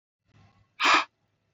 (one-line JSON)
{"exhalation_length": "1.5 s", "exhalation_amplitude": 13413, "exhalation_signal_mean_std_ratio": 0.31, "survey_phase": "beta (2021-08-13 to 2022-03-07)", "age": "45-64", "gender": "Male", "wearing_mask": "No", "symptom_none": true, "smoker_status": "Ex-smoker", "respiratory_condition_asthma": false, "respiratory_condition_other": false, "recruitment_source": "REACT", "submission_delay": "2 days", "covid_test_result": "Negative", "covid_test_method": "RT-qPCR", "influenza_a_test_result": "Negative", "influenza_b_test_result": "Negative"}